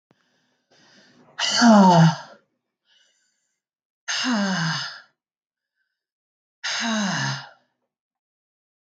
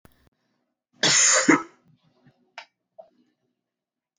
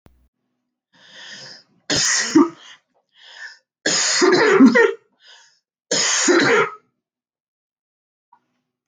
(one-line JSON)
{"exhalation_length": "9.0 s", "exhalation_amplitude": 23330, "exhalation_signal_mean_std_ratio": 0.37, "cough_length": "4.2 s", "cough_amplitude": 19199, "cough_signal_mean_std_ratio": 0.3, "three_cough_length": "8.9 s", "three_cough_amplitude": 27929, "three_cough_signal_mean_std_ratio": 0.43, "survey_phase": "beta (2021-08-13 to 2022-03-07)", "age": "45-64", "gender": "Female", "wearing_mask": "No", "symptom_cough_any": true, "symptom_sore_throat": true, "symptom_change_to_sense_of_smell_or_taste": true, "symptom_onset": "5 days", "smoker_status": "Ex-smoker", "respiratory_condition_asthma": false, "respiratory_condition_other": false, "recruitment_source": "Test and Trace", "submission_delay": "1 day", "covid_test_result": "Positive", "covid_test_method": "RT-qPCR", "covid_ct_value": 26.3, "covid_ct_gene": "ORF1ab gene"}